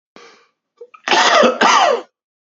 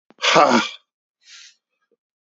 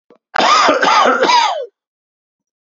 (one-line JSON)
{"cough_length": "2.6 s", "cough_amplitude": 30375, "cough_signal_mean_std_ratio": 0.52, "exhalation_length": "2.3 s", "exhalation_amplitude": 27978, "exhalation_signal_mean_std_ratio": 0.35, "three_cough_length": "2.6 s", "three_cough_amplitude": 29765, "three_cough_signal_mean_std_ratio": 0.63, "survey_phase": "beta (2021-08-13 to 2022-03-07)", "age": "18-44", "gender": "Male", "wearing_mask": "Yes", "symptom_sore_throat": true, "symptom_change_to_sense_of_smell_or_taste": true, "symptom_onset": "13 days", "smoker_status": "Current smoker (1 to 10 cigarettes per day)", "respiratory_condition_asthma": false, "respiratory_condition_other": false, "recruitment_source": "REACT", "submission_delay": "3 days", "covid_test_result": "Positive", "covid_test_method": "RT-qPCR", "covid_ct_value": 35.0, "covid_ct_gene": "E gene", "influenza_a_test_result": "Negative", "influenza_b_test_result": "Negative"}